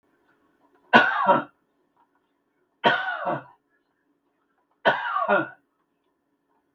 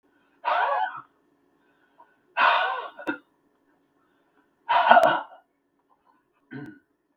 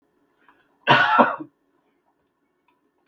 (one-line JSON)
{"three_cough_length": "6.7 s", "three_cough_amplitude": 32768, "three_cough_signal_mean_std_ratio": 0.34, "exhalation_length": "7.2 s", "exhalation_amplitude": 32766, "exhalation_signal_mean_std_ratio": 0.36, "cough_length": "3.1 s", "cough_amplitude": 32766, "cough_signal_mean_std_ratio": 0.31, "survey_phase": "beta (2021-08-13 to 2022-03-07)", "age": "65+", "gender": "Male", "wearing_mask": "No", "symptom_cough_any": true, "smoker_status": "Never smoked", "respiratory_condition_asthma": false, "respiratory_condition_other": false, "recruitment_source": "REACT", "submission_delay": "2 days", "covid_test_result": "Negative", "covid_test_method": "RT-qPCR", "influenza_a_test_result": "Negative", "influenza_b_test_result": "Negative"}